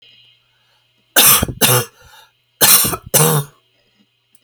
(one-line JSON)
{"cough_length": "4.4 s", "cough_amplitude": 32768, "cough_signal_mean_std_ratio": 0.42, "survey_phase": "alpha (2021-03-01 to 2021-08-12)", "age": "65+", "gender": "Female", "wearing_mask": "No", "symptom_none": true, "smoker_status": "Never smoked", "respiratory_condition_asthma": false, "respiratory_condition_other": true, "recruitment_source": "REACT", "submission_delay": "2 days", "covid_test_result": "Negative", "covid_test_method": "RT-qPCR"}